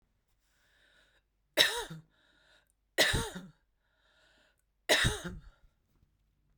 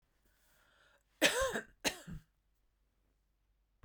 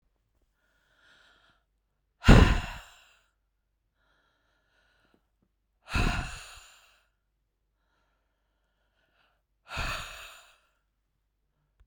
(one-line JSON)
{"three_cough_length": "6.6 s", "three_cough_amplitude": 12457, "three_cough_signal_mean_std_ratio": 0.3, "cough_length": "3.8 s", "cough_amplitude": 6908, "cough_signal_mean_std_ratio": 0.28, "exhalation_length": "11.9 s", "exhalation_amplitude": 24738, "exhalation_signal_mean_std_ratio": 0.19, "survey_phase": "beta (2021-08-13 to 2022-03-07)", "age": "65+", "gender": "Female", "wearing_mask": "No", "symptom_none": true, "smoker_status": "Never smoked", "respiratory_condition_asthma": false, "respiratory_condition_other": false, "recruitment_source": "REACT", "submission_delay": "2 days", "covid_test_result": "Negative", "covid_test_method": "RT-qPCR"}